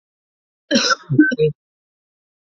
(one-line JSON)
{"cough_length": "2.6 s", "cough_amplitude": 27014, "cough_signal_mean_std_ratio": 0.39, "survey_phase": "beta (2021-08-13 to 2022-03-07)", "age": "18-44", "gender": "Female", "wearing_mask": "No", "symptom_cough_any": true, "symptom_runny_or_blocked_nose": true, "symptom_sore_throat": true, "symptom_fatigue": true, "symptom_headache": true, "symptom_change_to_sense_of_smell_or_taste": true, "symptom_loss_of_taste": true, "symptom_onset": "2 days", "smoker_status": "Ex-smoker", "respiratory_condition_asthma": false, "respiratory_condition_other": false, "recruitment_source": "Test and Trace", "submission_delay": "1 day", "covid_test_result": "Positive", "covid_test_method": "RT-qPCR", "covid_ct_value": 21.2, "covid_ct_gene": "ORF1ab gene"}